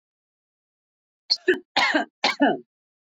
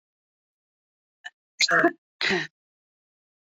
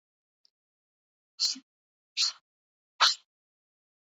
{"three_cough_length": "3.2 s", "three_cough_amplitude": 14860, "three_cough_signal_mean_std_ratio": 0.37, "cough_length": "3.6 s", "cough_amplitude": 14763, "cough_signal_mean_std_ratio": 0.29, "exhalation_length": "4.0 s", "exhalation_amplitude": 11368, "exhalation_signal_mean_std_ratio": 0.24, "survey_phase": "beta (2021-08-13 to 2022-03-07)", "age": "18-44", "gender": "Female", "wearing_mask": "No", "symptom_runny_or_blocked_nose": true, "symptom_change_to_sense_of_smell_or_taste": true, "symptom_loss_of_taste": true, "symptom_other": true, "smoker_status": "Current smoker (1 to 10 cigarettes per day)", "respiratory_condition_asthma": true, "respiratory_condition_other": false, "recruitment_source": "Test and Trace", "submission_delay": "1 day", "covid_test_result": "Positive", "covid_test_method": "ePCR"}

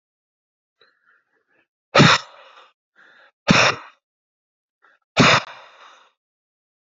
{"exhalation_length": "7.0 s", "exhalation_amplitude": 32009, "exhalation_signal_mean_std_ratio": 0.27, "survey_phase": "alpha (2021-03-01 to 2021-08-12)", "age": "45-64", "gender": "Male", "wearing_mask": "No", "symptom_cough_any": true, "symptom_new_continuous_cough": true, "symptom_shortness_of_breath": true, "symptom_fatigue": true, "symptom_headache": true, "symptom_onset": "1 day", "smoker_status": "Never smoked", "respiratory_condition_asthma": false, "respiratory_condition_other": false, "recruitment_source": "Test and Trace", "submission_delay": "0 days", "covid_test_result": "Negative", "covid_test_method": "RT-qPCR"}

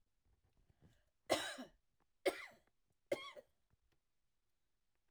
{"three_cough_length": "5.1 s", "three_cough_amplitude": 2617, "three_cough_signal_mean_std_ratio": 0.25, "survey_phase": "alpha (2021-03-01 to 2021-08-12)", "age": "65+", "gender": "Female", "wearing_mask": "No", "symptom_none": true, "smoker_status": "Never smoked", "respiratory_condition_asthma": false, "respiratory_condition_other": false, "recruitment_source": "REACT", "submission_delay": "2 days", "covid_test_result": "Negative", "covid_test_method": "RT-qPCR"}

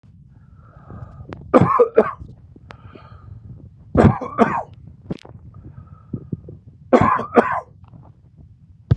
{"three_cough_length": "9.0 s", "three_cough_amplitude": 32768, "three_cough_signal_mean_std_ratio": 0.36, "survey_phase": "beta (2021-08-13 to 2022-03-07)", "age": "45-64", "gender": "Male", "wearing_mask": "No", "symptom_none": true, "smoker_status": "Ex-smoker", "respiratory_condition_asthma": false, "respiratory_condition_other": false, "recruitment_source": "REACT", "submission_delay": "32 days", "covid_test_result": "Negative", "covid_test_method": "RT-qPCR", "influenza_a_test_result": "Negative", "influenza_b_test_result": "Negative"}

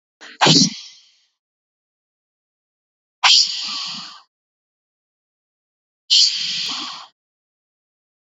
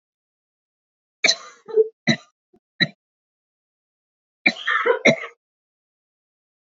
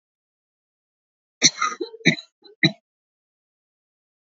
{"exhalation_length": "8.4 s", "exhalation_amplitude": 30928, "exhalation_signal_mean_std_ratio": 0.32, "three_cough_length": "6.7 s", "three_cough_amplitude": 28049, "three_cough_signal_mean_std_ratio": 0.28, "cough_length": "4.4 s", "cough_amplitude": 27431, "cough_signal_mean_std_ratio": 0.22, "survey_phase": "beta (2021-08-13 to 2022-03-07)", "age": "18-44", "gender": "Female", "wearing_mask": "No", "symptom_runny_or_blocked_nose": true, "symptom_headache": true, "symptom_onset": "11 days", "smoker_status": "Never smoked", "respiratory_condition_asthma": false, "respiratory_condition_other": false, "recruitment_source": "REACT", "submission_delay": "2 days", "covid_test_result": "Negative", "covid_test_method": "RT-qPCR", "influenza_a_test_result": "Negative", "influenza_b_test_result": "Negative"}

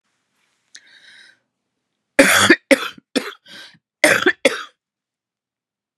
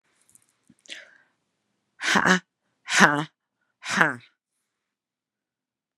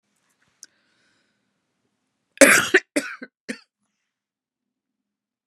{"cough_length": "6.0 s", "cough_amplitude": 32768, "cough_signal_mean_std_ratio": 0.3, "exhalation_length": "6.0 s", "exhalation_amplitude": 32767, "exhalation_signal_mean_std_ratio": 0.27, "three_cough_length": "5.5 s", "three_cough_amplitude": 32768, "three_cough_signal_mean_std_ratio": 0.2, "survey_phase": "beta (2021-08-13 to 2022-03-07)", "age": "45-64", "gender": "Female", "wearing_mask": "No", "symptom_cough_any": true, "symptom_new_continuous_cough": true, "symptom_runny_or_blocked_nose": true, "symptom_sore_throat": true, "symptom_diarrhoea": true, "symptom_fatigue": true, "symptom_headache": true, "symptom_onset": "3 days", "smoker_status": "Ex-smoker", "respiratory_condition_asthma": false, "respiratory_condition_other": false, "recruitment_source": "Test and Trace", "submission_delay": "1 day", "covid_test_result": "Positive", "covid_test_method": "ePCR"}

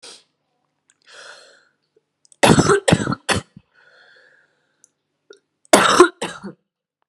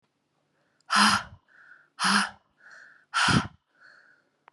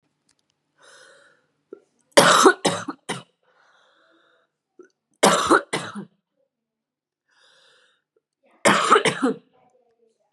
{"cough_length": "7.1 s", "cough_amplitude": 32768, "cough_signal_mean_std_ratio": 0.3, "exhalation_length": "4.5 s", "exhalation_amplitude": 14459, "exhalation_signal_mean_std_ratio": 0.37, "three_cough_length": "10.3 s", "three_cough_amplitude": 32767, "three_cough_signal_mean_std_ratio": 0.3, "survey_phase": "beta (2021-08-13 to 2022-03-07)", "age": "18-44", "gender": "Female", "wearing_mask": "No", "symptom_cough_any": true, "symptom_new_continuous_cough": true, "symptom_runny_or_blocked_nose": true, "symptom_shortness_of_breath": true, "symptom_sore_throat": true, "symptom_fatigue": true, "symptom_fever_high_temperature": true, "symptom_change_to_sense_of_smell_or_taste": true, "symptom_loss_of_taste": true, "symptom_onset": "10 days", "smoker_status": "Never smoked", "respiratory_condition_asthma": false, "respiratory_condition_other": false, "recruitment_source": "Test and Trace", "submission_delay": "1 day", "covid_test_result": "Positive", "covid_test_method": "RT-qPCR", "covid_ct_value": 22.2, "covid_ct_gene": "N gene"}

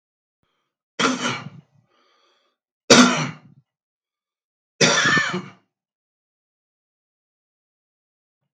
{"three_cough_length": "8.5 s", "three_cough_amplitude": 32768, "three_cough_signal_mean_std_ratio": 0.28, "survey_phase": "beta (2021-08-13 to 2022-03-07)", "age": "65+", "gender": "Male", "wearing_mask": "No", "symptom_cough_any": true, "symptom_onset": "8 days", "smoker_status": "Ex-smoker", "respiratory_condition_asthma": false, "respiratory_condition_other": false, "recruitment_source": "REACT", "submission_delay": "2 days", "covid_test_result": "Negative", "covid_test_method": "RT-qPCR", "influenza_a_test_result": "Negative", "influenza_b_test_result": "Negative"}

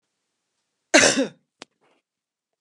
{"cough_length": "2.6 s", "cough_amplitude": 28866, "cough_signal_mean_std_ratio": 0.26, "survey_phase": "beta (2021-08-13 to 2022-03-07)", "age": "45-64", "gender": "Female", "wearing_mask": "No", "symptom_none": true, "smoker_status": "Ex-smoker", "respiratory_condition_asthma": false, "respiratory_condition_other": false, "recruitment_source": "REACT", "submission_delay": "2 days", "covid_test_result": "Negative", "covid_test_method": "RT-qPCR", "influenza_a_test_result": "Negative", "influenza_b_test_result": "Negative"}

